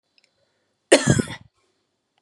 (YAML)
cough_length: 2.2 s
cough_amplitude: 32175
cough_signal_mean_std_ratio: 0.26
survey_phase: beta (2021-08-13 to 2022-03-07)
age: 18-44
gender: Female
wearing_mask: 'No'
symptom_runny_or_blocked_nose: true
symptom_sore_throat: true
symptom_fatigue: true
symptom_headache: true
smoker_status: Never smoked
respiratory_condition_asthma: false
respiratory_condition_other: false
recruitment_source: REACT
submission_delay: 1 day
covid_test_result: Negative
covid_test_method: RT-qPCR
influenza_a_test_result: Negative
influenza_b_test_result: Negative